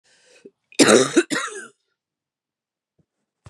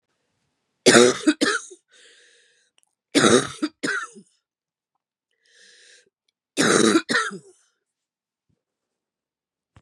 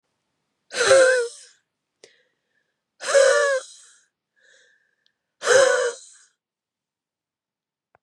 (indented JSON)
{
  "cough_length": "3.5 s",
  "cough_amplitude": 30752,
  "cough_signal_mean_std_ratio": 0.29,
  "three_cough_length": "9.8 s",
  "three_cough_amplitude": 32434,
  "three_cough_signal_mean_std_ratio": 0.32,
  "exhalation_length": "8.0 s",
  "exhalation_amplitude": 23808,
  "exhalation_signal_mean_std_ratio": 0.36,
  "survey_phase": "beta (2021-08-13 to 2022-03-07)",
  "age": "45-64",
  "gender": "Female",
  "wearing_mask": "No",
  "symptom_new_continuous_cough": true,
  "symptom_runny_or_blocked_nose": true,
  "symptom_shortness_of_breath": true,
  "symptom_sore_throat": true,
  "symptom_fever_high_temperature": true,
  "symptom_headache": true,
  "symptom_other": true,
  "smoker_status": "Never smoked",
  "respiratory_condition_asthma": true,
  "respiratory_condition_other": false,
  "recruitment_source": "Test and Trace",
  "submission_delay": "2 days",
  "covid_test_result": "Positive",
  "covid_test_method": "LFT"
}